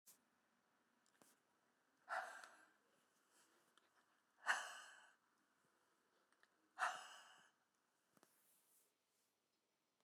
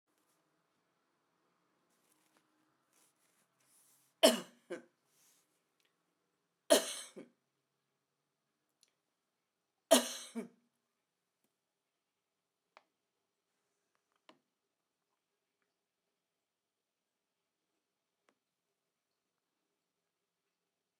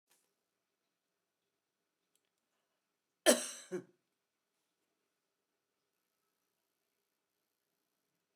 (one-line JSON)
{"exhalation_length": "10.0 s", "exhalation_amplitude": 1709, "exhalation_signal_mean_std_ratio": 0.25, "three_cough_length": "21.0 s", "three_cough_amplitude": 9113, "three_cough_signal_mean_std_ratio": 0.12, "cough_length": "8.4 s", "cough_amplitude": 6973, "cough_signal_mean_std_ratio": 0.12, "survey_phase": "beta (2021-08-13 to 2022-03-07)", "age": "65+", "gender": "Female", "wearing_mask": "No", "symptom_none": true, "symptom_onset": "12 days", "smoker_status": "Ex-smoker", "respiratory_condition_asthma": false, "respiratory_condition_other": false, "recruitment_source": "REACT", "submission_delay": "1 day", "covid_test_result": "Negative", "covid_test_method": "RT-qPCR"}